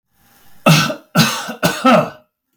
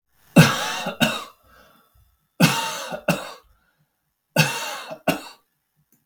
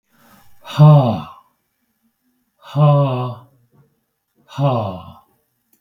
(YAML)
cough_length: 2.6 s
cough_amplitude: 32768
cough_signal_mean_std_ratio: 0.51
three_cough_length: 6.1 s
three_cough_amplitude: 32768
three_cough_signal_mean_std_ratio: 0.37
exhalation_length: 5.8 s
exhalation_amplitude: 32766
exhalation_signal_mean_std_ratio: 0.38
survey_phase: beta (2021-08-13 to 2022-03-07)
age: 65+
gender: Male
wearing_mask: 'No'
symptom_none: true
smoker_status: Ex-smoker
respiratory_condition_asthma: false
respiratory_condition_other: false
recruitment_source: REACT
submission_delay: 1 day
covid_test_result: Negative
covid_test_method: RT-qPCR